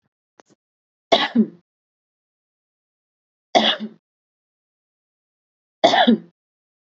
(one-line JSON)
{"three_cough_length": "6.9 s", "three_cough_amplitude": 29105, "three_cough_signal_mean_std_ratio": 0.27, "survey_phase": "beta (2021-08-13 to 2022-03-07)", "age": "18-44", "gender": "Female", "wearing_mask": "No", "symptom_none": true, "symptom_onset": "9 days", "smoker_status": "Ex-smoker", "respiratory_condition_asthma": true, "respiratory_condition_other": false, "recruitment_source": "REACT", "submission_delay": "1 day", "covid_test_result": "Negative", "covid_test_method": "RT-qPCR", "influenza_a_test_result": "Negative", "influenza_b_test_result": "Negative"}